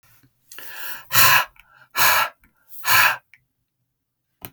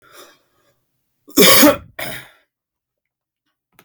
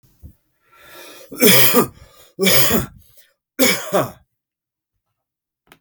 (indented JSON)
{
  "exhalation_length": "4.5 s",
  "exhalation_amplitude": 32768,
  "exhalation_signal_mean_std_ratio": 0.4,
  "cough_length": "3.8 s",
  "cough_amplitude": 32768,
  "cough_signal_mean_std_ratio": 0.3,
  "three_cough_length": "5.8 s",
  "three_cough_amplitude": 32768,
  "three_cough_signal_mean_std_ratio": 0.4,
  "survey_phase": "beta (2021-08-13 to 2022-03-07)",
  "age": "45-64",
  "gender": "Male",
  "wearing_mask": "No",
  "symptom_cough_any": true,
  "symptom_runny_or_blocked_nose": true,
  "symptom_sore_throat": true,
  "symptom_fatigue": true,
  "smoker_status": "Ex-smoker",
  "respiratory_condition_asthma": false,
  "respiratory_condition_other": false,
  "recruitment_source": "Test and Trace",
  "submission_delay": "2 days",
  "covid_test_result": "Positive",
  "covid_test_method": "RT-qPCR",
  "covid_ct_value": 24.7,
  "covid_ct_gene": "N gene"
}